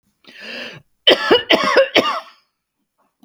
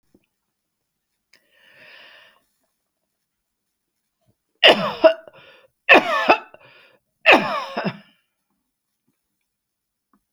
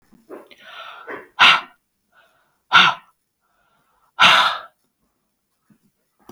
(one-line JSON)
{"cough_length": "3.2 s", "cough_amplitude": 32768, "cough_signal_mean_std_ratio": 0.43, "three_cough_length": "10.3 s", "three_cough_amplitude": 32768, "three_cough_signal_mean_std_ratio": 0.24, "exhalation_length": "6.3 s", "exhalation_amplitude": 32768, "exhalation_signal_mean_std_ratio": 0.29, "survey_phase": "beta (2021-08-13 to 2022-03-07)", "age": "65+", "gender": "Female", "wearing_mask": "No", "symptom_none": true, "smoker_status": "Ex-smoker", "respiratory_condition_asthma": false, "respiratory_condition_other": false, "recruitment_source": "REACT", "submission_delay": "2 days", "covid_test_result": "Negative", "covid_test_method": "RT-qPCR", "influenza_a_test_result": "Negative", "influenza_b_test_result": "Negative"}